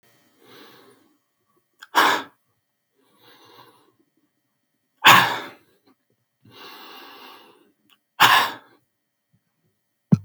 {"exhalation_length": "10.2 s", "exhalation_amplitude": 32768, "exhalation_signal_mean_std_ratio": 0.24, "survey_phase": "beta (2021-08-13 to 2022-03-07)", "age": "45-64", "gender": "Male", "wearing_mask": "No", "symptom_cough_any": true, "smoker_status": "Never smoked", "respiratory_condition_asthma": true, "respiratory_condition_other": false, "recruitment_source": "REACT", "submission_delay": "1 day", "covid_test_result": "Negative", "covid_test_method": "RT-qPCR", "influenza_a_test_result": "Negative", "influenza_b_test_result": "Negative"}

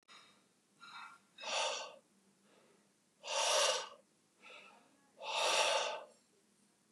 {"exhalation_length": "6.9 s", "exhalation_amplitude": 3705, "exhalation_signal_mean_std_ratio": 0.45, "survey_phase": "beta (2021-08-13 to 2022-03-07)", "age": "45-64", "gender": "Male", "wearing_mask": "No", "symptom_cough_any": true, "smoker_status": "Never smoked", "respiratory_condition_asthma": false, "respiratory_condition_other": false, "recruitment_source": "REACT", "submission_delay": "2 days", "covid_test_result": "Negative", "covid_test_method": "RT-qPCR", "influenza_a_test_result": "Negative", "influenza_b_test_result": "Negative"}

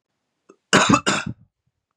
{"cough_length": "2.0 s", "cough_amplitude": 31902, "cough_signal_mean_std_ratio": 0.37, "survey_phase": "beta (2021-08-13 to 2022-03-07)", "age": "18-44", "gender": "Male", "wearing_mask": "No", "symptom_none": true, "smoker_status": "Never smoked", "respiratory_condition_asthma": false, "respiratory_condition_other": false, "recruitment_source": "REACT", "submission_delay": "2 days", "covid_test_result": "Negative", "covid_test_method": "RT-qPCR", "influenza_a_test_result": "Unknown/Void", "influenza_b_test_result": "Unknown/Void"}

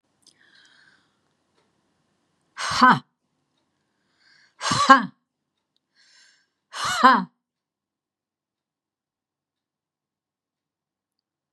{"exhalation_length": "11.5 s", "exhalation_amplitude": 32763, "exhalation_signal_mean_std_ratio": 0.21, "survey_phase": "beta (2021-08-13 to 2022-03-07)", "age": "65+", "gender": "Female", "wearing_mask": "No", "symptom_none": true, "smoker_status": "Ex-smoker", "respiratory_condition_asthma": false, "respiratory_condition_other": false, "recruitment_source": "REACT", "submission_delay": "1 day", "covid_test_result": "Negative", "covid_test_method": "RT-qPCR"}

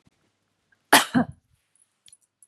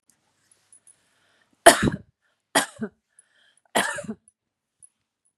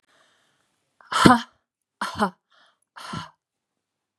{"cough_length": "2.5 s", "cough_amplitude": 32379, "cough_signal_mean_std_ratio": 0.22, "three_cough_length": "5.4 s", "three_cough_amplitude": 32768, "three_cough_signal_mean_std_ratio": 0.21, "exhalation_length": "4.2 s", "exhalation_amplitude": 32768, "exhalation_signal_mean_std_ratio": 0.24, "survey_phase": "beta (2021-08-13 to 2022-03-07)", "age": "45-64", "gender": "Female", "wearing_mask": "No", "symptom_abdominal_pain": true, "smoker_status": "Ex-smoker", "respiratory_condition_asthma": false, "respiratory_condition_other": false, "recruitment_source": "REACT", "submission_delay": "1 day", "covid_test_result": "Negative", "covid_test_method": "RT-qPCR", "influenza_a_test_result": "Unknown/Void", "influenza_b_test_result": "Unknown/Void"}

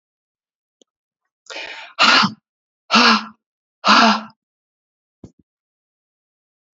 {"exhalation_length": "6.7 s", "exhalation_amplitude": 32767, "exhalation_signal_mean_std_ratio": 0.32, "survey_phase": "beta (2021-08-13 to 2022-03-07)", "age": "45-64", "gender": "Female", "wearing_mask": "No", "symptom_cough_any": true, "symptom_runny_or_blocked_nose": true, "symptom_shortness_of_breath": true, "symptom_fatigue": true, "symptom_headache": true, "symptom_onset": "4 days", "smoker_status": "Current smoker (1 to 10 cigarettes per day)", "respiratory_condition_asthma": false, "respiratory_condition_other": false, "recruitment_source": "Test and Trace", "submission_delay": "1 day", "covid_test_result": "Positive", "covid_test_method": "RT-qPCR", "covid_ct_value": 24.9, "covid_ct_gene": "N gene"}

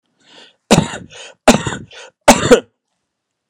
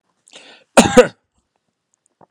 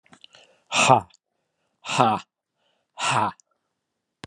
{"three_cough_length": "3.5 s", "three_cough_amplitude": 32768, "three_cough_signal_mean_std_ratio": 0.33, "cough_length": "2.3 s", "cough_amplitude": 32768, "cough_signal_mean_std_ratio": 0.24, "exhalation_length": "4.3 s", "exhalation_amplitude": 29461, "exhalation_signal_mean_std_ratio": 0.34, "survey_phase": "alpha (2021-03-01 to 2021-08-12)", "age": "65+", "gender": "Male", "wearing_mask": "No", "symptom_none": true, "smoker_status": "Never smoked", "respiratory_condition_asthma": false, "respiratory_condition_other": true, "recruitment_source": "REACT", "submission_delay": "2 days", "covid_test_result": "Negative", "covid_test_method": "RT-qPCR"}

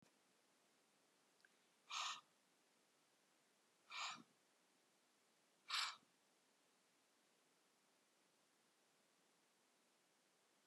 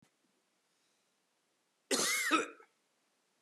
{"exhalation_length": "10.7 s", "exhalation_amplitude": 968, "exhalation_signal_mean_std_ratio": 0.27, "cough_length": "3.4 s", "cough_amplitude": 5921, "cough_signal_mean_std_ratio": 0.33, "survey_phase": "beta (2021-08-13 to 2022-03-07)", "age": "65+", "gender": "Male", "wearing_mask": "No", "symptom_none": true, "smoker_status": "Never smoked", "respiratory_condition_asthma": false, "respiratory_condition_other": false, "recruitment_source": "REACT", "submission_delay": "0 days", "covid_test_result": "Negative", "covid_test_method": "RT-qPCR"}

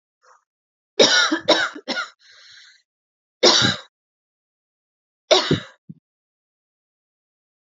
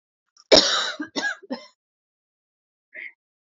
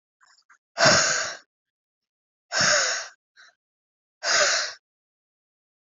{"three_cough_length": "7.7 s", "three_cough_amplitude": 31902, "three_cough_signal_mean_std_ratio": 0.32, "cough_length": "3.4 s", "cough_amplitude": 32227, "cough_signal_mean_std_ratio": 0.3, "exhalation_length": "5.8 s", "exhalation_amplitude": 21779, "exhalation_signal_mean_std_ratio": 0.41, "survey_phase": "alpha (2021-03-01 to 2021-08-12)", "age": "18-44", "gender": "Female", "wearing_mask": "No", "symptom_cough_any": true, "symptom_shortness_of_breath": true, "symptom_fatigue": true, "symptom_fever_high_temperature": true, "symptom_headache": true, "symptom_change_to_sense_of_smell_or_taste": true, "symptom_onset": "2 days", "smoker_status": "Never smoked", "respiratory_condition_asthma": true, "respiratory_condition_other": false, "recruitment_source": "Test and Trace", "submission_delay": "1 day", "covid_test_result": "Positive", "covid_test_method": "RT-qPCR", "covid_ct_value": 19.7, "covid_ct_gene": "ORF1ab gene", "covid_ct_mean": 20.5, "covid_viral_load": "180000 copies/ml", "covid_viral_load_category": "Low viral load (10K-1M copies/ml)"}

